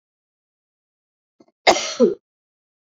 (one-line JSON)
{"cough_length": "2.9 s", "cough_amplitude": 32767, "cough_signal_mean_std_ratio": 0.25, "survey_phase": "beta (2021-08-13 to 2022-03-07)", "age": "45-64", "gender": "Female", "wearing_mask": "No", "symptom_cough_any": true, "symptom_runny_or_blocked_nose": true, "symptom_sore_throat": true, "symptom_onset": "3 days", "smoker_status": "Never smoked", "respiratory_condition_asthma": false, "respiratory_condition_other": false, "recruitment_source": "Test and Trace", "submission_delay": "1 day", "covid_test_result": "Positive", "covid_test_method": "RT-qPCR"}